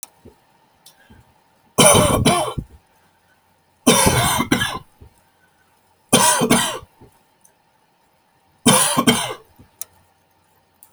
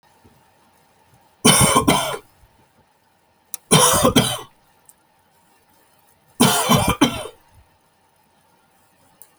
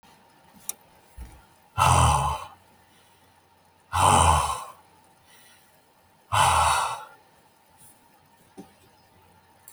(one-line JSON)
{"cough_length": "10.9 s", "cough_amplitude": 32768, "cough_signal_mean_std_ratio": 0.41, "three_cough_length": "9.4 s", "three_cough_amplitude": 32768, "three_cough_signal_mean_std_ratio": 0.37, "exhalation_length": "9.7 s", "exhalation_amplitude": 18510, "exhalation_signal_mean_std_ratio": 0.38, "survey_phase": "beta (2021-08-13 to 2022-03-07)", "age": "65+", "gender": "Male", "wearing_mask": "No", "symptom_none": true, "smoker_status": "Never smoked", "respiratory_condition_asthma": false, "respiratory_condition_other": false, "recruitment_source": "REACT", "submission_delay": "2 days", "covid_test_result": "Negative", "covid_test_method": "RT-qPCR"}